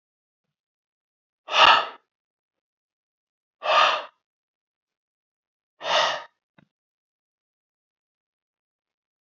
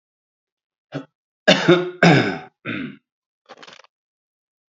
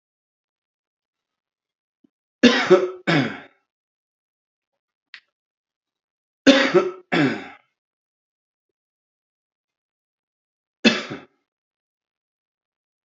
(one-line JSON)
{"exhalation_length": "9.2 s", "exhalation_amplitude": 26177, "exhalation_signal_mean_std_ratio": 0.24, "cough_length": "4.7 s", "cough_amplitude": 28578, "cough_signal_mean_std_ratio": 0.32, "three_cough_length": "13.1 s", "three_cough_amplitude": 28268, "three_cough_signal_mean_std_ratio": 0.25, "survey_phase": "beta (2021-08-13 to 2022-03-07)", "age": "45-64", "gender": "Male", "wearing_mask": "No", "symptom_cough_any": true, "symptom_runny_or_blocked_nose": true, "symptom_shortness_of_breath": true, "symptom_sore_throat": true, "symptom_fatigue": true, "symptom_fever_high_temperature": true, "symptom_headache": true, "symptom_onset": "3 days", "smoker_status": "Ex-smoker", "respiratory_condition_asthma": true, "respiratory_condition_other": false, "recruitment_source": "Test and Trace", "submission_delay": "2 days", "covid_test_result": "Positive", "covid_test_method": "RT-qPCR", "covid_ct_value": 27.0, "covid_ct_gene": "ORF1ab gene", "covid_ct_mean": 27.4, "covid_viral_load": "1000 copies/ml", "covid_viral_load_category": "Minimal viral load (< 10K copies/ml)"}